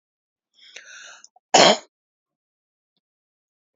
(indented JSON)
{
  "three_cough_length": "3.8 s",
  "three_cough_amplitude": 28972,
  "three_cough_signal_mean_std_ratio": 0.2,
  "survey_phase": "beta (2021-08-13 to 2022-03-07)",
  "age": "65+",
  "gender": "Female",
  "wearing_mask": "No",
  "symptom_none": true,
  "smoker_status": "Never smoked",
  "respiratory_condition_asthma": true,
  "respiratory_condition_other": false,
  "recruitment_source": "REACT",
  "submission_delay": "4 days",
  "covid_test_result": "Negative",
  "covid_test_method": "RT-qPCR",
  "influenza_a_test_result": "Negative",
  "influenza_b_test_result": "Negative"
}